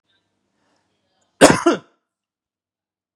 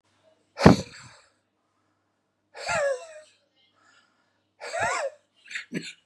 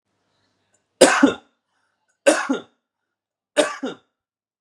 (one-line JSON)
{"cough_length": "3.2 s", "cough_amplitude": 32768, "cough_signal_mean_std_ratio": 0.22, "exhalation_length": "6.1 s", "exhalation_amplitude": 32767, "exhalation_signal_mean_std_ratio": 0.27, "three_cough_length": "4.6 s", "three_cough_amplitude": 32768, "three_cough_signal_mean_std_ratio": 0.29, "survey_phase": "beta (2021-08-13 to 2022-03-07)", "age": "45-64", "gender": "Male", "wearing_mask": "No", "symptom_none": true, "smoker_status": "Never smoked", "respiratory_condition_asthma": true, "respiratory_condition_other": false, "recruitment_source": "Test and Trace", "submission_delay": "-1 day", "covid_test_result": "Negative", "covid_test_method": "LFT"}